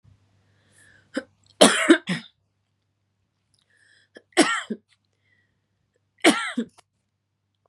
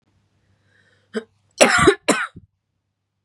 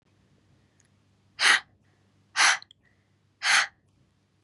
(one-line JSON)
{"three_cough_length": "7.7 s", "three_cough_amplitude": 32767, "three_cough_signal_mean_std_ratio": 0.25, "cough_length": "3.2 s", "cough_amplitude": 32768, "cough_signal_mean_std_ratio": 0.31, "exhalation_length": "4.4 s", "exhalation_amplitude": 16251, "exhalation_signal_mean_std_ratio": 0.3, "survey_phase": "beta (2021-08-13 to 2022-03-07)", "age": "18-44", "gender": "Female", "wearing_mask": "No", "symptom_cough_any": true, "symptom_sore_throat": true, "symptom_fatigue": true, "symptom_headache": true, "smoker_status": "Ex-smoker", "respiratory_condition_asthma": false, "respiratory_condition_other": false, "recruitment_source": "Test and Trace", "submission_delay": "2 days", "covid_test_result": "Positive", "covid_test_method": "RT-qPCR", "covid_ct_value": 27.7, "covid_ct_gene": "N gene"}